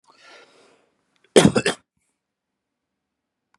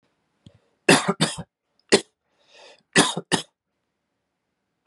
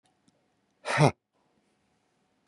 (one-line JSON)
{"cough_length": "3.6 s", "cough_amplitude": 32700, "cough_signal_mean_std_ratio": 0.2, "three_cough_length": "4.9 s", "three_cough_amplitude": 29804, "three_cough_signal_mean_std_ratio": 0.27, "exhalation_length": "2.5 s", "exhalation_amplitude": 16241, "exhalation_signal_mean_std_ratio": 0.22, "survey_phase": "beta (2021-08-13 to 2022-03-07)", "age": "45-64", "gender": "Male", "wearing_mask": "No", "symptom_none": true, "smoker_status": "Current smoker (1 to 10 cigarettes per day)", "respiratory_condition_asthma": false, "respiratory_condition_other": false, "recruitment_source": "REACT", "submission_delay": "1 day", "covid_test_result": "Negative", "covid_test_method": "RT-qPCR", "influenza_a_test_result": "Negative", "influenza_b_test_result": "Negative"}